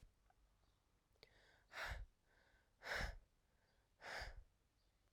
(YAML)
exhalation_length: 5.1 s
exhalation_amplitude: 777
exhalation_signal_mean_std_ratio: 0.41
survey_phase: alpha (2021-03-01 to 2021-08-12)
age: 18-44
gender: Female
wearing_mask: 'No'
symptom_cough_any: true
symptom_fatigue: true
symptom_fever_high_temperature: true
symptom_headache: true
symptom_onset: 3 days
smoker_status: Never smoked
respiratory_condition_asthma: false
respiratory_condition_other: false
recruitment_source: Test and Trace
submission_delay: 1 day
covid_test_result: Positive
covid_test_method: RT-qPCR